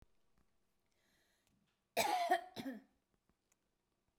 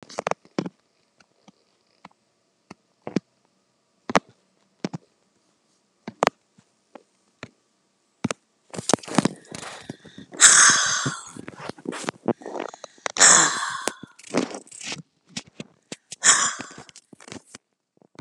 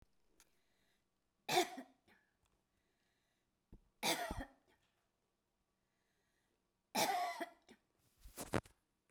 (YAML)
cough_length: 4.2 s
cough_amplitude: 3311
cough_signal_mean_std_ratio: 0.31
exhalation_length: 18.2 s
exhalation_amplitude: 32768
exhalation_signal_mean_std_ratio: 0.28
three_cough_length: 9.1 s
three_cough_amplitude: 3180
three_cough_signal_mean_std_ratio: 0.29
survey_phase: beta (2021-08-13 to 2022-03-07)
age: 65+
gender: Female
wearing_mask: 'No'
symptom_cough_any: true
symptom_runny_or_blocked_nose: true
smoker_status: Ex-smoker
respiratory_condition_asthma: false
respiratory_condition_other: false
recruitment_source: REACT
submission_delay: 1 day
covid_test_result: Negative
covid_test_method: RT-qPCR